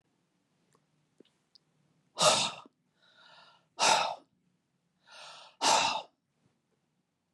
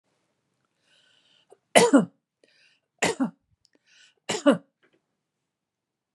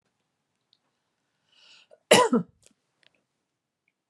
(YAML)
exhalation_length: 7.3 s
exhalation_amplitude: 9122
exhalation_signal_mean_std_ratio: 0.31
three_cough_length: 6.1 s
three_cough_amplitude: 31334
three_cough_signal_mean_std_ratio: 0.24
cough_length: 4.1 s
cough_amplitude: 21026
cough_signal_mean_std_ratio: 0.2
survey_phase: beta (2021-08-13 to 2022-03-07)
age: 65+
gender: Female
wearing_mask: 'No'
symptom_none: true
smoker_status: Ex-smoker
respiratory_condition_asthma: false
respiratory_condition_other: false
recruitment_source: REACT
submission_delay: 5 days
covid_test_result: Negative
covid_test_method: RT-qPCR
influenza_a_test_result: Negative
influenza_b_test_result: Negative